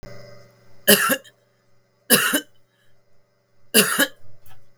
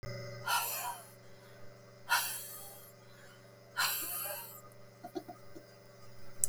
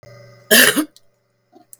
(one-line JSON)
{"three_cough_length": "4.8 s", "three_cough_amplitude": 32768, "three_cough_signal_mean_std_ratio": 0.39, "exhalation_length": "6.5 s", "exhalation_amplitude": 15834, "exhalation_signal_mean_std_ratio": 0.6, "cough_length": "1.8 s", "cough_amplitude": 32768, "cough_signal_mean_std_ratio": 0.34, "survey_phase": "beta (2021-08-13 to 2022-03-07)", "age": "45-64", "gender": "Female", "wearing_mask": "No", "symptom_cough_any": true, "symptom_runny_or_blocked_nose": true, "symptom_sore_throat": true, "symptom_fever_high_temperature": true, "symptom_headache": true, "symptom_onset": "6 days", "smoker_status": "Current smoker (1 to 10 cigarettes per day)", "respiratory_condition_asthma": false, "respiratory_condition_other": false, "recruitment_source": "REACT", "submission_delay": "3 days", "covid_test_result": "Negative", "covid_test_method": "RT-qPCR", "influenza_a_test_result": "Negative", "influenza_b_test_result": "Negative"}